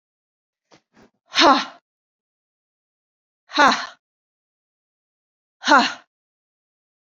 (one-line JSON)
{"exhalation_length": "7.2 s", "exhalation_amplitude": 30369, "exhalation_signal_mean_std_ratio": 0.24, "survey_phase": "beta (2021-08-13 to 2022-03-07)", "age": "45-64", "gender": "Female", "wearing_mask": "No", "symptom_cough_any": true, "smoker_status": "Never smoked", "respiratory_condition_asthma": false, "respiratory_condition_other": false, "recruitment_source": "REACT", "submission_delay": "2 days", "covid_test_result": "Negative", "covid_test_method": "RT-qPCR"}